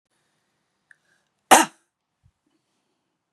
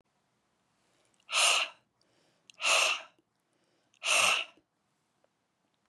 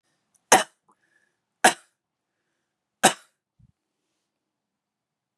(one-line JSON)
{"cough_length": "3.3 s", "cough_amplitude": 32768, "cough_signal_mean_std_ratio": 0.15, "exhalation_length": "5.9 s", "exhalation_amplitude": 7892, "exhalation_signal_mean_std_ratio": 0.36, "three_cough_length": "5.4 s", "three_cough_amplitude": 30882, "three_cough_signal_mean_std_ratio": 0.16, "survey_phase": "beta (2021-08-13 to 2022-03-07)", "age": "45-64", "gender": "Female", "wearing_mask": "No", "symptom_cough_any": true, "symptom_onset": "12 days", "smoker_status": "Ex-smoker", "respiratory_condition_asthma": false, "respiratory_condition_other": false, "recruitment_source": "REACT", "submission_delay": "1 day", "covid_test_result": "Negative", "covid_test_method": "RT-qPCR", "influenza_a_test_result": "Negative", "influenza_b_test_result": "Negative"}